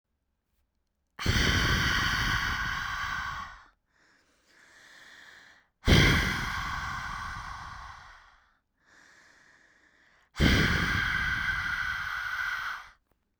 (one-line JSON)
{"exhalation_length": "13.4 s", "exhalation_amplitude": 12222, "exhalation_signal_mean_std_ratio": 0.56, "survey_phase": "beta (2021-08-13 to 2022-03-07)", "age": "18-44", "gender": "Female", "wearing_mask": "No", "symptom_none": true, "smoker_status": "Ex-smoker", "respiratory_condition_asthma": true, "respiratory_condition_other": false, "recruitment_source": "REACT", "submission_delay": "2 days", "covid_test_result": "Negative", "covid_test_method": "RT-qPCR", "influenza_a_test_result": "Unknown/Void", "influenza_b_test_result": "Unknown/Void"}